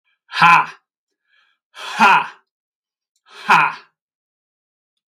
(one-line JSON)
{"exhalation_length": "5.1 s", "exhalation_amplitude": 32768, "exhalation_signal_mean_std_ratio": 0.32, "survey_phase": "beta (2021-08-13 to 2022-03-07)", "age": "65+", "gender": "Male", "wearing_mask": "No", "symptom_none": true, "smoker_status": "Never smoked", "respiratory_condition_asthma": false, "respiratory_condition_other": false, "recruitment_source": "REACT", "submission_delay": "3 days", "covid_test_result": "Negative", "covid_test_method": "RT-qPCR"}